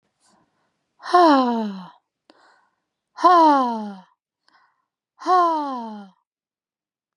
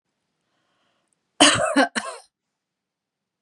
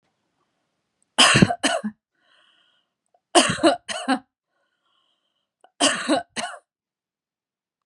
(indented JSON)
{
  "exhalation_length": "7.2 s",
  "exhalation_amplitude": 22596,
  "exhalation_signal_mean_std_ratio": 0.41,
  "cough_length": "3.4 s",
  "cough_amplitude": 32753,
  "cough_signal_mean_std_ratio": 0.29,
  "three_cough_length": "7.9 s",
  "three_cough_amplitude": 31448,
  "three_cough_signal_mean_std_ratio": 0.32,
  "survey_phase": "beta (2021-08-13 to 2022-03-07)",
  "age": "18-44",
  "gender": "Female",
  "wearing_mask": "No",
  "symptom_none": true,
  "symptom_onset": "9 days",
  "smoker_status": "Never smoked",
  "respiratory_condition_asthma": false,
  "respiratory_condition_other": false,
  "recruitment_source": "REACT",
  "submission_delay": "1 day",
  "covid_test_result": "Negative",
  "covid_test_method": "RT-qPCR"
}